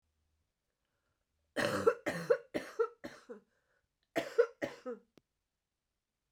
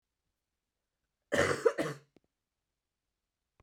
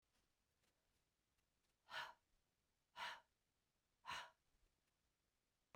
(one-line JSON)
{"three_cough_length": "6.3 s", "three_cough_amplitude": 6125, "three_cough_signal_mean_std_ratio": 0.31, "cough_length": "3.6 s", "cough_amplitude": 6634, "cough_signal_mean_std_ratio": 0.27, "exhalation_length": "5.8 s", "exhalation_amplitude": 410, "exhalation_signal_mean_std_ratio": 0.29, "survey_phase": "beta (2021-08-13 to 2022-03-07)", "age": "45-64", "gender": "Female", "wearing_mask": "No", "symptom_cough_any": true, "symptom_runny_or_blocked_nose": true, "symptom_sore_throat": true, "symptom_diarrhoea": true, "symptom_fatigue": true, "symptom_fever_high_temperature": true, "symptom_headache": true, "symptom_change_to_sense_of_smell_or_taste": true, "symptom_loss_of_taste": true, "symptom_onset": "4 days", "smoker_status": "Never smoked", "respiratory_condition_asthma": false, "respiratory_condition_other": false, "recruitment_source": "Test and Trace", "submission_delay": "2 days", "covid_test_result": "Positive", "covid_test_method": "RT-qPCR", "covid_ct_value": 16.7, "covid_ct_gene": "ORF1ab gene"}